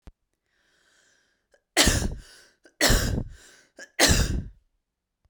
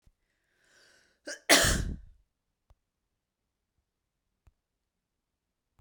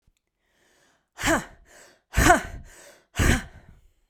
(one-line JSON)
{"three_cough_length": "5.3 s", "three_cough_amplitude": 21083, "three_cough_signal_mean_std_ratio": 0.39, "cough_length": "5.8 s", "cough_amplitude": 17514, "cough_signal_mean_std_ratio": 0.21, "exhalation_length": "4.1 s", "exhalation_amplitude": 26674, "exhalation_signal_mean_std_ratio": 0.34, "survey_phase": "beta (2021-08-13 to 2022-03-07)", "age": "45-64", "gender": "Female", "wearing_mask": "No", "symptom_none": true, "smoker_status": "Ex-smoker", "respiratory_condition_asthma": false, "respiratory_condition_other": false, "recruitment_source": "REACT", "submission_delay": "4 days", "covid_test_result": "Negative", "covid_test_method": "RT-qPCR"}